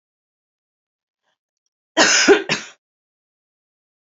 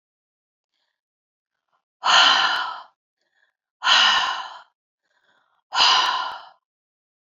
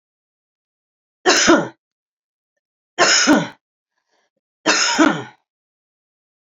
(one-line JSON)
{"cough_length": "4.2 s", "cough_amplitude": 30565, "cough_signal_mean_std_ratio": 0.27, "exhalation_length": "7.3 s", "exhalation_amplitude": 25162, "exhalation_signal_mean_std_ratio": 0.4, "three_cough_length": "6.6 s", "three_cough_amplitude": 31296, "three_cough_signal_mean_std_ratio": 0.37, "survey_phase": "beta (2021-08-13 to 2022-03-07)", "age": "45-64", "gender": "Female", "wearing_mask": "No", "symptom_fatigue": true, "smoker_status": "Ex-smoker", "respiratory_condition_asthma": false, "respiratory_condition_other": false, "recruitment_source": "REACT", "submission_delay": "1 day", "covid_test_result": "Negative", "covid_test_method": "RT-qPCR", "influenza_a_test_result": "Negative", "influenza_b_test_result": "Negative"}